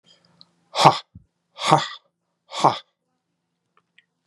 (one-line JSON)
{"exhalation_length": "4.3 s", "exhalation_amplitude": 32768, "exhalation_signal_mean_std_ratio": 0.25, "survey_phase": "beta (2021-08-13 to 2022-03-07)", "age": "45-64", "gender": "Male", "wearing_mask": "No", "symptom_cough_any": true, "symptom_new_continuous_cough": true, "symptom_runny_or_blocked_nose": true, "symptom_shortness_of_breath": true, "symptom_fatigue": true, "symptom_headache": true, "smoker_status": "Never smoked", "respiratory_condition_asthma": false, "respiratory_condition_other": false, "recruitment_source": "Test and Trace", "submission_delay": "0 days", "covid_test_result": "Positive", "covid_test_method": "LFT"}